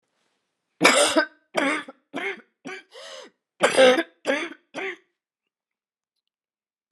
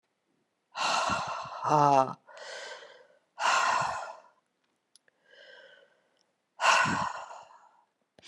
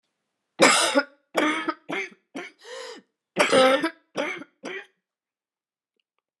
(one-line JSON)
{"cough_length": "6.9 s", "cough_amplitude": 27500, "cough_signal_mean_std_ratio": 0.36, "exhalation_length": "8.3 s", "exhalation_amplitude": 11602, "exhalation_signal_mean_std_ratio": 0.44, "three_cough_length": "6.4 s", "three_cough_amplitude": 27250, "three_cough_signal_mean_std_ratio": 0.4, "survey_phase": "beta (2021-08-13 to 2022-03-07)", "age": "65+", "gender": "Female", "wearing_mask": "No", "symptom_cough_any": true, "symptom_new_continuous_cough": true, "symptom_runny_or_blocked_nose": true, "symptom_sore_throat": true, "symptom_diarrhoea": true, "symptom_headache": true, "smoker_status": "Never smoked", "respiratory_condition_asthma": false, "respiratory_condition_other": false, "recruitment_source": "Test and Trace", "submission_delay": "1 day", "covid_test_result": "Positive", "covid_test_method": "LFT"}